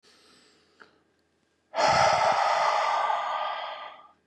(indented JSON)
{
  "exhalation_length": "4.3 s",
  "exhalation_amplitude": 9985,
  "exhalation_signal_mean_std_ratio": 0.61,
  "survey_phase": "beta (2021-08-13 to 2022-03-07)",
  "age": "45-64",
  "gender": "Male",
  "wearing_mask": "No",
  "symptom_none": true,
  "smoker_status": "Current smoker (11 or more cigarettes per day)",
  "respiratory_condition_asthma": false,
  "respiratory_condition_other": false,
  "recruitment_source": "REACT",
  "submission_delay": "2 days",
  "covid_test_result": "Negative",
  "covid_test_method": "RT-qPCR",
  "influenza_a_test_result": "Negative",
  "influenza_b_test_result": "Negative"
}